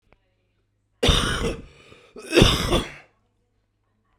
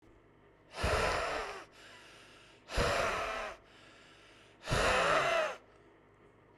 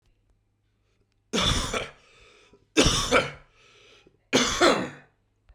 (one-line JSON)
{"cough_length": "4.2 s", "cough_amplitude": 32042, "cough_signal_mean_std_ratio": 0.39, "exhalation_length": "6.6 s", "exhalation_amplitude": 5171, "exhalation_signal_mean_std_ratio": 0.56, "three_cough_length": "5.5 s", "three_cough_amplitude": 20655, "three_cough_signal_mean_std_ratio": 0.41, "survey_phase": "beta (2021-08-13 to 2022-03-07)", "age": "18-44", "gender": "Male", "wearing_mask": "No", "symptom_cough_any": true, "symptom_new_continuous_cough": true, "symptom_runny_or_blocked_nose": true, "symptom_shortness_of_breath": true, "symptom_sore_throat": true, "symptom_fatigue": true, "symptom_fever_high_temperature": true, "symptom_change_to_sense_of_smell_or_taste": true, "symptom_loss_of_taste": true, "symptom_onset": "3 days", "smoker_status": "Current smoker (11 or more cigarettes per day)", "respiratory_condition_asthma": false, "respiratory_condition_other": false, "recruitment_source": "Test and Trace", "submission_delay": "2 days", "covid_test_result": "Positive", "covid_test_method": "LAMP"}